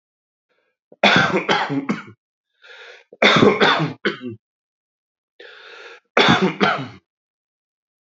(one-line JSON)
{"cough_length": "8.0 s", "cough_amplitude": 29549, "cough_signal_mean_std_ratio": 0.42, "survey_phase": "beta (2021-08-13 to 2022-03-07)", "age": "45-64", "gender": "Male", "wearing_mask": "No", "symptom_none": true, "symptom_onset": "3 days", "smoker_status": "Current smoker (e-cigarettes or vapes only)", "respiratory_condition_asthma": false, "respiratory_condition_other": false, "recruitment_source": "Test and Trace", "submission_delay": "2 days", "covid_test_result": "Positive", "covid_test_method": "RT-qPCR", "covid_ct_value": 22.1, "covid_ct_gene": "ORF1ab gene", "covid_ct_mean": 22.3, "covid_viral_load": "47000 copies/ml", "covid_viral_load_category": "Low viral load (10K-1M copies/ml)"}